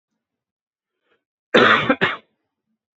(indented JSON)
{
  "cough_length": "3.0 s",
  "cough_amplitude": 29068,
  "cough_signal_mean_std_ratio": 0.32,
  "survey_phase": "beta (2021-08-13 to 2022-03-07)",
  "age": "18-44",
  "gender": "Male",
  "wearing_mask": "No",
  "symptom_cough_any": true,
  "symptom_fatigue": true,
  "symptom_fever_high_temperature": true,
  "symptom_headache": true,
  "symptom_onset": "2 days",
  "smoker_status": "Never smoked",
  "respiratory_condition_asthma": false,
  "respiratory_condition_other": false,
  "recruitment_source": "Test and Trace",
  "submission_delay": "2 days",
  "covid_test_result": "Positive",
  "covid_test_method": "RT-qPCR"
}